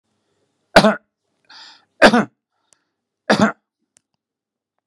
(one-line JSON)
{"three_cough_length": "4.9 s", "three_cough_amplitude": 32768, "three_cough_signal_mean_std_ratio": 0.25, "survey_phase": "beta (2021-08-13 to 2022-03-07)", "age": "65+", "gender": "Male", "wearing_mask": "No", "symptom_none": true, "smoker_status": "Ex-smoker", "respiratory_condition_asthma": false, "respiratory_condition_other": false, "recruitment_source": "REACT", "submission_delay": "9 days", "covid_test_result": "Negative", "covid_test_method": "RT-qPCR", "influenza_a_test_result": "Unknown/Void", "influenza_b_test_result": "Unknown/Void"}